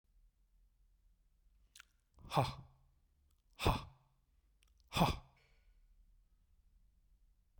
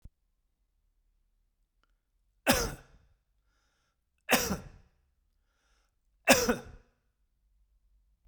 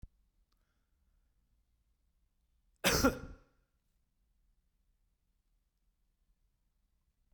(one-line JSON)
{"exhalation_length": "7.6 s", "exhalation_amplitude": 4229, "exhalation_signal_mean_std_ratio": 0.25, "three_cough_length": "8.3 s", "three_cough_amplitude": 19041, "three_cough_signal_mean_std_ratio": 0.23, "cough_length": "7.3 s", "cough_amplitude": 5519, "cough_signal_mean_std_ratio": 0.18, "survey_phase": "beta (2021-08-13 to 2022-03-07)", "age": "65+", "gender": "Male", "wearing_mask": "No", "symptom_none": true, "smoker_status": "Never smoked", "respiratory_condition_asthma": false, "respiratory_condition_other": false, "recruitment_source": "REACT", "submission_delay": "2 days", "covid_test_result": "Negative", "covid_test_method": "RT-qPCR", "influenza_a_test_result": "Negative", "influenza_b_test_result": "Negative"}